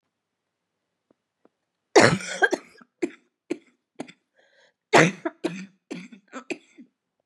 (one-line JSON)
{"cough_length": "7.3 s", "cough_amplitude": 27362, "cough_signal_mean_std_ratio": 0.25, "survey_phase": "beta (2021-08-13 to 2022-03-07)", "age": "45-64", "gender": "Female", "wearing_mask": "No", "symptom_cough_any": true, "symptom_runny_or_blocked_nose": true, "symptom_sore_throat": true, "symptom_fatigue": true, "symptom_headache": true, "symptom_onset": "7 days", "smoker_status": "Never smoked", "respiratory_condition_asthma": false, "respiratory_condition_other": false, "recruitment_source": "Test and Trace", "submission_delay": "2 days", "covid_test_result": "Positive", "covid_test_method": "RT-qPCR", "covid_ct_value": 30.6, "covid_ct_gene": "ORF1ab gene", "covid_ct_mean": 31.3, "covid_viral_load": "54 copies/ml", "covid_viral_load_category": "Minimal viral load (< 10K copies/ml)"}